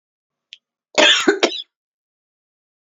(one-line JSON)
{"cough_length": "3.0 s", "cough_amplitude": 31495, "cough_signal_mean_std_ratio": 0.31, "survey_phase": "beta (2021-08-13 to 2022-03-07)", "age": "18-44", "gender": "Female", "wearing_mask": "No", "symptom_abdominal_pain": true, "symptom_diarrhoea": true, "symptom_fatigue": true, "symptom_headache": true, "smoker_status": "Never smoked", "respiratory_condition_asthma": false, "respiratory_condition_other": false, "recruitment_source": "Test and Trace", "submission_delay": "3 days", "covid_test_result": "Negative", "covid_test_method": "RT-qPCR"}